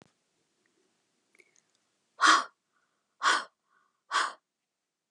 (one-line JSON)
{"exhalation_length": "5.1 s", "exhalation_amplitude": 13113, "exhalation_signal_mean_std_ratio": 0.26, "survey_phase": "beta (2021-08-13 to 2022-03-07)", "age": "45-64", "gender": "Female", "wearing_mask": "No", "symptom_none": true, "smoker_status": "Never smoked", "respiratory_condition_asthma": false, "respiratory_condition_other": false, "recruitment_source": "REACT", "submission_delay": "11 days", "covid_test_result": "Negative", "covid_test_method": "RT-qPCR"}